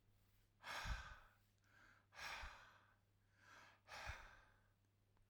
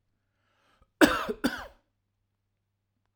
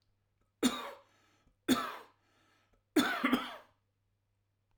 {"exhalation_length": "5.3 s", "exhalation_amplitude": 529, "exhalation_signal_mean_std_ratio": 0.5, "cough_length": "3.2 s", "cough_amplitude": 21295, "cough_signal_mean_std_ratio": 0.23, "three_cough_length": "4.8 s", "three_cough_amplitude": 5984, "three_cough_signal_mean_std_ratio": 0.34, "survey_phase": "alpha (2021-03-01 to 2021-08-12)", "age": "45-64", "gender": "Male", "wearing_mask": "No", "symptom_none": true, "smoker_status": "Ex-smoker", "respiratory_condition_asthma": false, "respiratory_condition_other": false, "recruitment_source": "REACT", "submission_delay": "1 day", "covid_test_result": "Negative", "covid_test_method": "RT-qPCR"}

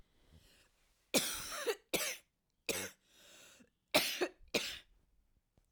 {"three_cough_length": "5.7 s", "three_cough_amplitude": 6314, "three_cough_signal_mean_std_ratio": 0.38, "survey_phase": "alpha (2021-03-01 to 2021-08-12)", "age": "45-64", "gender": "Female", "wearing_mask": "No", "symptom_cough_any": true, "symptom_abdominal_pain": true, "symptom_fatigue": true, "symptom_fever_high_temperature": true, "symptom_headache": true, "symptom_change_to_sense_of_smell_or_taste": true, "smoker_status": "Never smoked", "respiratory_condition_asthma": false, "respiratory_condition_other": false, "recruitment_source": "Test and Trace", "submission_delay": "1 day", "covid_test_result": "Positive", "covid_test_method": "RT-qPCR", "covid_ct_value": 19.1, "covid_ct_gene": "ORF1ab gene", "covid_ct_mean": 19.6, "covid_viral_load": "380000 copies/ml", "covid_viral_load_category": "Low viral load (10K-1M copies/ml)"}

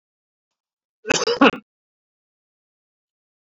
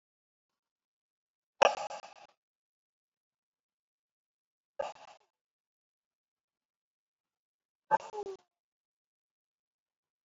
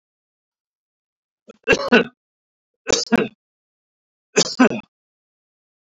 {"cough_length": "3.4 s", "cough_amplitude": 27003, "cough_signal_mean_std_ratio": 0.23, "exhalation_length": "10.2 s", "exhalation_amplitude": 13694, "exhalation_signal_mean_std_ratio": 0.14, "three_cough_length": "5.8 s", "three_cough_amplitude": 27513, "three_cough_signal_mean_std_ratio": 0.28, "survey_phase": "beta (2021-08-13 to 2022-03-07)", "age": "65+", "gender": "Male", "wearing_mask": "No", "symptom_none": true, "smoker_status": "Ex-smoker", "respiratory_condition_asthma": false, "respiratory_condition_other": false, "recruitment_source": "REACT", "submission_delay": "1 day", "covid_test_result": "Negative", "covid_test_method": "RT-qPCR"}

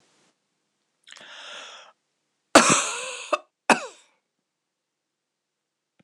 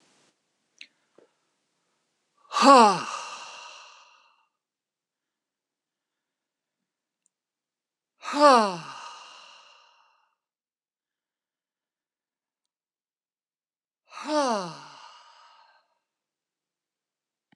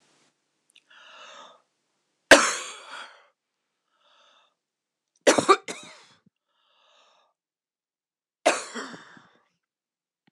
{"cough_length": "6.0 s", "cough_amplitude": 26028, "cough_signal_mean_std_ratio": 0.23, "exhalation_length": "17.6 s", "exhalation_amplitude": 23569, "exhalation_signal_mean_std_ratio": 0.2, "three_cough_length": "10.3 s", "three_cough_amplitude": 26028, "three_cough_signal_mean_std_ratio": 0.19, "survey_phase": "beta (2021-08-13 to 2022-03-07)", "age": "65+", "gender": "Female", "wearing_mask": "No", "symptom_none": true, "smoker_status": "Never smoked", "respiratory_condition_asthma": false, "respiratory_condition_other": false, "recruitment_source": "REACT", "submission_delay": "1 day", "covid_test_result": "Negative", "covid_test_method": "RT-qPCR", "influenza_a_test_result": "Negative", "influenza_b_test_result": "Negative"}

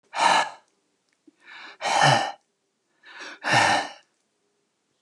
{"exhalation_length": "5.0 s", "exhalation_amplitude": 15668, "exhalation_signal_mean_std_ratio": 0.42, "survey_phase": "beta (2021-08-13 to 2022-03-07)", "age": "65+", "gender": "Male", "wearing_mask": "No", "symptom_none": true, "smoker_status": "Never smoked", "respiratory_condition_asthma": false, "respiratory_condition_other": false, "recruitment_source": "REACT", "submission_delay": "1 day", "covid_test_result": "Negative", "covid_test_method": "RT-qPCR", "influenza_a_test_result": "Negative", "influenza_b_test_result": "Negative"}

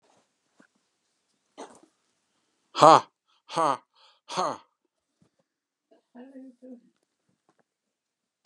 {"exhalation_length": "8.5 s", "exhalation_amplitude": 28527, "exhalation_signal_mean_std_ratio": 0.17, "survey_phase": "beta (2021-08-13 to 2022-03-07)", "age": "65+", "gender": "Male", "wearing_mask": "No", "symptom_none": true, "smoker_status": "Ex-smoker", "respiratory_condition_asthma": false, "respiratory_condition_other": false, "recruitment_source": "REACT", "submission_delay": "2 days", "covid_test_result": "Negative", "covid_test_method": "RT-qPCR", "influenza_a_test_result": "Negative", "influenza_b_test_result": "Negative"}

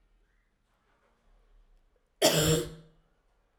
{"cough_length": "3.6 s", "cough_amplitude": 11689, "cough_signal_mean_std_ratio": 0.29, "survey_phase": "alpha (2021-03-01 to 2021-08-12)", "age": "18-44", "gender": "Female", "wearing_mask": "No", "symptom_cough_any": true, "symptom_diarrhoea": true, "symptom_fatigue": true, "symptom_headache": true, "symptom_change_to_sense_of_smell_or_taste": true, "symptom_loss_of_taste": true, "symptom_onset": "2 days", "smoker_status": "Ex-smoker", "respiratory_condition_asthma": false, "respiratory_condition_other": false, "recruitment_source": "Test and Trace", "submission_delay": "2 days", "covid_test_result": "Positive", "covid_test_method": "RT-qPCR", "covid_ct_value": 20.6, "covid_ct_gene": "ORF1ab gene"}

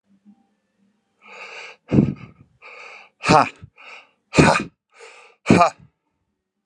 {"exhalation_length": "6.7 s", "exhalation_amplitude": 32767, "exhalation_signal_mean_std_ratio": 0.3, "survey_phase": "alpha (2021-03-01 to 2021-08-12)", "age": "45-64", "gender": "Male", "wearing_mask": "No", "symptom_none": true, "smoker_status": "Current smoker (e-cigarettes or vapes only)", "respiratory_condition_asthma": false, "respiratory_condition_other": false, "recruitment_source": "REACT", "submission_delay": "7 days", "covid_test_result": "Negative", "covid_test_method": "RT-qPCR"}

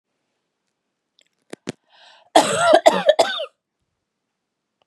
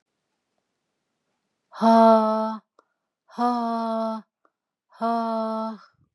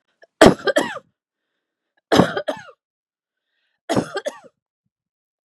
{"cough_length": "4.9 s", "cough_amplitude": 32768, "cough_signal_mean_std_ratio": 0.31, "exhalation_length": "6.1 s", "exhalation_amplitude": 21442, "exhalation_signal_mean_std_ratio": 0.43, "three_cough_length": "5.5 s", "three_cough_amplitude": 32768, "three_cough_signal_mean_std_ratio": 0.27, "survey_phase": "beta (2021-08-13 to 2022-03-07)", "age": "45-64", "gender": "Female", "wearing_mask": "No", "symptom_none": true, "smoker_status": "Never smoked", "respiratory_condition_asthma": false, "respiratory_condition_other": false, "recruitment_source": "REACT", "submission_delay": "1 day", "covid_test_result": "Negative", "covid_test_method": "RT-qPCR", "influenza_a_test_result": "Negative", "influenza_b_test_result": "Negative"}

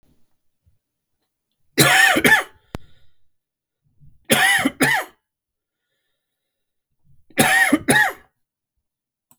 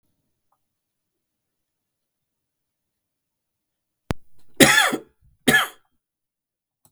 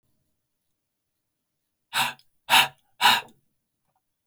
{"three_cough_length": "9.4 s", "three_cough_amplitude": 32768, "three_cough_signal_mean_std_ratio": 0.37, "cough_length": "6.9 s", "cough_amplitude": 32768, "cough_signal_mean_std_ratio": 0.23, "exhalation_length": "4.3 s", "exhalation_amplitude": 19598, "exhalation_signal_mean_std_ratio": 0.26, "survey_phase": "beta (2021-08-13 to 2022-03-07)", "age": "18-44", "gender": "Male", "wearing_mask": "No", "symptom_cough_any": true, "symptom_runny_or_blocked_nose": true, "symptom_fatigue": true, "symptom_fever_high_temperature": true, "symptom_headache": true, "symptom_onset": "4 days", "smoker_status": "Ex-smoker", "respiratory_condition_asthma": false, "respiratory_condition_other": false, "recruitment_source": "Test and Trace", "submission_delay": "2 days", "covid_test_result": "Positive", "covid_test_method": "RT-qPCR"}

